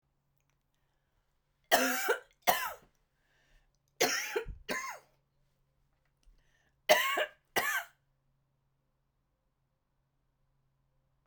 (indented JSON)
{
  "three_cough_length": "11.3 s",
  "three_cough_amplitude": 10684,
  "three_cough_signal_mean_std_ratio": 0.31,
  "survey_phase": "beta (2021-08-13 to 2022-03-07)",
  "age": "45-64",
  "gender": "Female",
  "wearing_mask": "No",
  "symptom_none": true,
  "smoker_status": "Never smoked",
  "respiratory_condition_asthma": false,
  "respiratory_condition_other": false,
  "recruitment_source": "REACT",
  "submission_delay": "1 day",
  "covid_test_result": "Negative",
  "covid_test_method": "RT-qPCR"
}